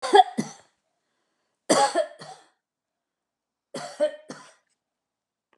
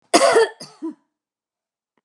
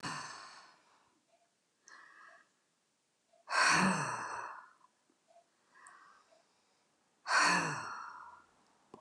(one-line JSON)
{"three_cough_length": "5.6 s", "three_cough_amplitude": 24127, "three_cough_signal_mean_std_ratio": 0.27, "cough_length": "2.0 s", "cough_amplitude": 32767, "cough_signal_mean_std_ratio": 0.36, "exhalation_length": "9.0 s", "exhalation_amplitude": 4854, "exhalation_signal_mean_std_ratio": 0.37, "survey_phase": "alpha (2021-03-01 to 2021-08-12)", "age": "65+", "gender": "Female", "wearing_mask": "No", "symptom_none": true, "smoker_status": "Never smoked", "respiratory_condition_asthma": false, "respiratory_condition_other": false, "recruitment_source": "REACT", "submission_delay": "1 day", "covid_test_result": "Negative", "covid_test_method": "RT-qPCR"}